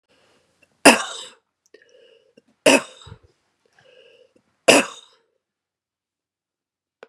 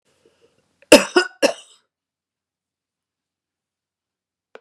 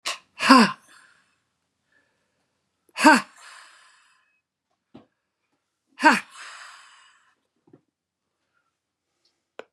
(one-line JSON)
{"three_cough_length": "7.1 s", "three_cough_amplitude": 32768, "three_cough_signal_mean_std_ratio": 0.2, "cough_length": "4.6 s", "cough_amplitude": 32768, "cough_signal_mean_std_ratio": 0.18, "exhalation_length": "9.7 s", "exhalation_amplitude": 32119, "exhalation_signal_mean_std_ratio": 0.21, "survey_phase": "beta (2021-08-13 to 2022-03-07)", "age": "65+", "gender": "Female", "wearing_mask": "No", "symptom_cough_any": true, "symptom_onset": "11 days", "smoker_status": "Never smoked", "respiratory_condition_asthma": false, "respiratory_condition_other": false, "recruitment_source": "REACT", "submission_delay": "2 days", "covid_test_result": "Negative", "covid_test_method": "RT-qPCR", "influenza_a_test_result": "Negative", "influenza_b_test_result": "Negative"}